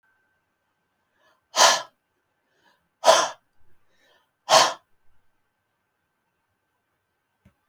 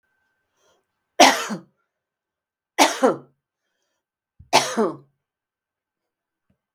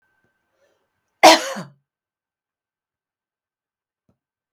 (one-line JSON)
{"exhalation_length": "7.7 s", "exhalation_amplitude": 28395, "exhalation_signal_mean_std_ratio": 0.23, "three_cough_length": "6.7 s", "three_cough_amplitude": 32768, "three_cough_signal_mean_std_ratio": 0.26, "cough_length": "4.5 s", "cough_amplitude": 32768, "cough_signal_mean_std_ratio": 0.17, "survey_phase": "beta (2021-08-13 to 2022-03-07)", "age": "65+", "gender": "Female", "wearing_mask": "No", "symptom_runny_or_blocked_nose": true, "symptom_onset": "12 days", "smoker_status": "Never smoked", "respiratory_condition_asthma": false, "respiratory_condition_other": false, "recruitment_source": "REACT", "submission_delay": "0 days", "covid_test_result": "Negative", "covid_test_method": "RT-qPCR", "influenza_a_test_result": "Unknown/Void", "influenza_b_test_result": "Unknown/Void"}